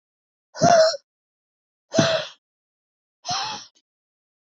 {"exhalation_length": "4.5 s", "exhalation_amplitude": 23855, "exhalation_signal_mean_std_ratio": 0.34, "survey_phase": "beta (2021-08-13 to 2022-03-07)", "age": "45-64", "gender": "Female", "wearing_mask": "No", "symptom_cough_any": true, "symptom_runny_or_blocked_nose": true, "symptom_sore_throat": true, "symptom_abdominal_pain": true, "symptom_diarrhoea": true, "symptom_fatigue": true, "symptom_headache": true, "symptom_change_to_sense_of_smell_or_taste": true, "symptom_loss_of_taste": true, "symptom_other": true, "symptom_onset": "3 days", "smoker_status": "Current smoker (1 to 10 cigarettes per day)", "respiratory_condition_asthma": false, "respiratory_condition_other": false, "recruitment_source": "Test and Trace", "submission_delay": "1 day", "covid_test_result": "Positive", "covid_test_method": "RT-qPCR"}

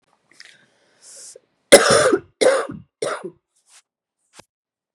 {"three_cough_length": "4.9 s", "three_cough_amplitude": 32768, "three_cough_signal_mean_std_ratio": 0.31, "survey_phase": "beta (2021-08-13 to 2022-03-07)", "age": "45-64", "gender": "Female", "wearing_mask": "No", "symptom_cough_any": true, "symptom_runny_or_blocked_nose": true, "symptom_other": true, "smoker_status": "Current smoker (1 to 10 cigarettes per day)", "respiratory_condition_asthma": true, "respiratory_condition_other": false, "recruitment_source": "Test and Trace", "submission_delay": "1 day", "covid_test_result": "Positive", "covid_test_method": "LFT"}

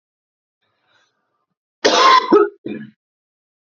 {"cough_length": "3.8 s", "cough_amplitude": 30560, "cough_signal_mean_std_ratio": 0.34, "survey_phase": "beta (2021-08-13 to 2022-03-07)", "age": "18-44", "gender": "Male", "wearing_mask": "No", "symptom_runny_or_blocked_nose": true, "symptom_shortness_of_breath": true, "symptom_fatigue": true, "symptom_fever_high_temperature": true, "symptom_headache": true, "symptom_onset": "5 days", "smoker_status": "Never smoked", "respiratory_condition_asthma": false, "respiratory_condition_other": false, "recruitment_source": "Test and Trace", "submission_delay": "1 day", "covid_test_result": "Positive", "covid_test_method": "RT-qPCR", "covid_ct_value": 18.6, "covid_ct_gene": "ORF1ab gene"}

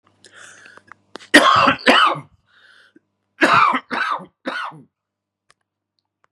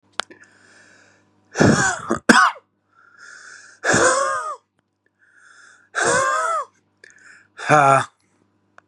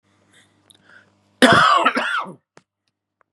{"three_cough_length": "6.3 s", "three_cough_amplitude": 32768, "three_cough_signal_mean_std_ratio": 0.39, "exhalation_length": "8.9 s", "exhalation_amplitude": 32768, "exhalation_signal_mean_std_ratio": 0.42, "cough_length": "3.3 s", "cough_amplitude": 32767, "cough_signal_mean_std_ratio": 0.38, "survey_phase": "beta (2021-08-13 to 2022-03-07)", "age": "18-44", "gender": "Male", "wearing_mask": "No", "symptom_headache": true, "symptom_other": true, "smoker_status": "Never smoked", "respiratory_condition_asthma": false, "respiratory_condition_other": false, "recruitment_source": "Test and Trace", "submission_delay": "2 days", "covid_test_result": "Positive", "covid_test_method": "RT-qPCR", "covid_ct_value": 18.4, "covid_ct_gene": "N gene"}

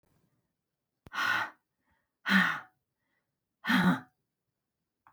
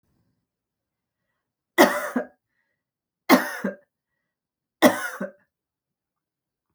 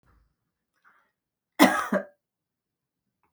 {"exhalation_length": "5.1 s", "exhalation_amplitude": 8608, "exhalation_signal_mean_std_ratio": 0.35, "three_cough_length": "6.7 s", "three_cough_amplitude": 32060, "three_cough_signal_mean_std_ratio": 0.24, "cough_length": "3.3 s", "cough_amplitude": 28849, "cough_signal_mean_std_ratio": 0.22, "survey_phase": "beta (2021-08-13 to 2022-03-07)", "age": "45-64", "gender": "Female", "wearing_mask": "No", "symptom_none": true, "smoker_status": "Ex-smoker", "respiratory_condition_asthma": false, "respiratory_condition_other": false, "recruitment_source": "REACT", "submission_delay": "2 days", "covid_test_result": "Negative", "covid_test_method": "RT-qPCR"}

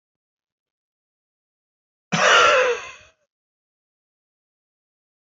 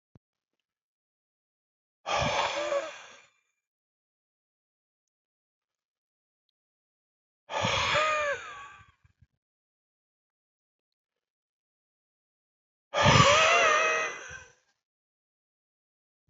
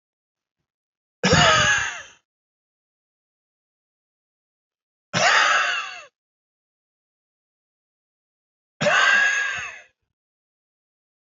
{"cough_length": "5.2 s", "cough_amplitude": 23413, "cough_signal_mean_std_ratio": 0.29, "exhalation_length": "16.3 s", "exhalation_amplitude": 16167, "exhalation_signal_mean_std_ratio": 0.33, "three_cough_length": "11.3 s", "three_cough_amplitude": 20263, "three_cough_signal_mean_std_ratio": 0.36, "survey_phase": "alpha (2021-03-01 to 2021-08-12)", "age": "65+", "gender": "Male", "wearing_mask": "No", "symptom_none": true, "smoker_status": "Ex-smoker", "respiratory_condition_asthma": false, "respiratory_condition_other": false, "recruitment_source": "REACT", "submission_delay": "1 day", "covid_test_result": "Negative", "covid_test_method": "RT-qPCR"}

